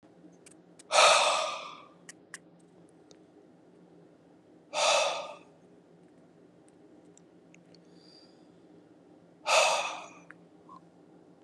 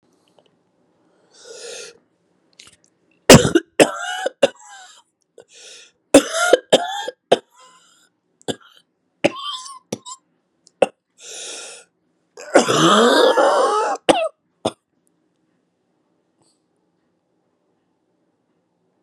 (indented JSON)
{
  "exhalation_length": "11.4 s",
  "exhalation_amplitude": 12112,
  "exhalation_signal_mean_std_ratio": 0.33,
  "cough_length": "19.0 s",
  "cough_amplitude": 32768,
  "cough_signal_mean_std_ratio": 0.3,
  "survey_phase": "beta (2021-08-13 to 2022-03-07)",
  "age": "45-64",
  "gender": "Female",
  "wearing_mask": "No",
  "symptom_new_continuous_cough": true,
  "symptom_runny_or_blocked_nose": true,
  "symptom_shortness_of_breath": true,
  "symptom_sore_throat": true,
  "symptom_fatigue": true,
  "symptom_fever_high_temperature": true,
  "symptom_change_to_sense_of_smell_or_taste": true,
  "smoker_status": "Ex-smoker",
  "respiratory_condition_asthma": false,
  "respiratory_condition_other": false,
  "recruitment_source": "Test and Trace",
  "submission_delay": "1 day",
  "covid_test_result": "Negative",
  "covid_test_method": "RT-qPCR"
}